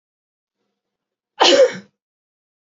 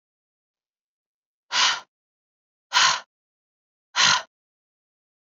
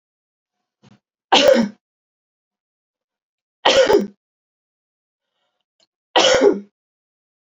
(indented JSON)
{
  "cough_length": "2.7 s",
  "cough_amplitude": 32768,
  "cough_signal_mean_std_ratio": 0.28,
  "exhalation_length": "5.2 s",
  "exhalation_amplitude": 20900,
  "exhalation_signal_mean_std_ratio": 0.3,
  "three_cough_length": "7.4 s",
  "three_cough_amplitude": 32768,
  "three_cough_signal_mean_std_ratio": 0.32,
  "survey_phase": "beta (2021-08-13 to 2022-03-07)",
  "age": "18-44",
  "gender": "Female",
  "wearing_mask": "No",
  "symptom_runny_or_blocked_nose": true,
  "smoker_status": "Never smoked",
  "respiratory_condition_asthma": true,
  "respiratory_condition_other": false,
  "recruitment_source": "Test and Trace",
  "submission_delay": "1 day",
  "covid_test_result": "Positive",
  "covid_test_method": "RT-qPCR"
}